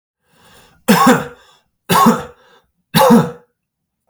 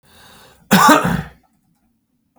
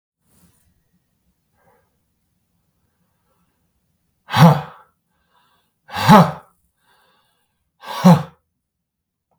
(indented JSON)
{
  "three_cough_length": "4.1 s",
  "three_cough_amplitude": 32768,
  "three_cough_signal_mean_std_ratio": 0.42,
  "cough_length": "2.4 s",
  "cough_amplitude": 32768,
  "cough_signal_mean_std_ratio": 0.37,
  "exhalation_length": "9.4 s",
  "exhalation_amplitude": 32768,
  "exhalation_signal_mean_std_ratio": 0.22,
  "survey_phase": "beta (2021-08-13 to 2022-03-07)",
  "age": "18-44",
  "gender": "Male",
  "wearing_mask": "No",
  "symptom_none": true,
  "symptom_onset": "12 days",
  "smoker_status": "Never smoked",
  "respiratory_condition_asthma": false,
  "respiratory_condition_other": false,
  "recruitment_source": "REACT",
  "submission_delay": "1 day",
  "covid_test_result": "Negative",
  "covid_test_method": "RT-qPCR",
  "influenza_a_test_result": "Negative",
  "influenza_b_test_result": "Negative"
}